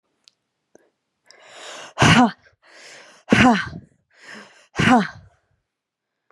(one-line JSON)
{"exhalation_length": "6.3 s", "exhalation_amplitude": 29248, "exhalation_signal_mean_std_ratio": 0.33, "survey_phase": "beta (2021-08-13 to 2022-03-07)", "age": "18-44", "gender": "Female", "wearing_mask": "No", "symptom_runny_or_blocked_nose": true, "symptom_shortness_of_breath": true, "smoker_status": "Ex-smoker", "respiratory_condition_asthma": false, "respiratory_condition_other": false, "recruitment_source": "Test and Trace", "submission_delay": "2 days", "covid_test_result": "Positive", "covid_test_method": "ePCR"}